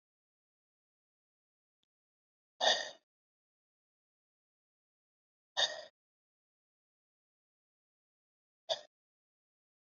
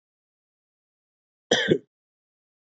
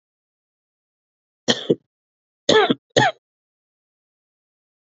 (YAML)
exhalation_length: 10.0 s
exhalation_amplitude: 5602
exhalation_signal_mean_std_ratio: 0.16
cough_length: 2.6 s
cough_amplitude: 18230
cough_signal_mean_std_ratio: 0.23
three_cough_length: 4.9 s
three_cough_amplitude: 29089
three_cough_signal_mean_std_ratio: 0.25
survey_phase: beta (2021-08-13 to 2022-03-07)
age: 18-44
gender: Male
wearing_mask: 'No'
symptom_none: true
smoker_status: Never smoked
respiratory_condition_asthma: false
respiratory_condition_other: false
recruitment_source: REACT
submission_delay: 1 day
covid_test_result: Negative
covid_test_method: RT-qPCR
influenza_a_test_result: Negative
influenza_b_test_result: Negative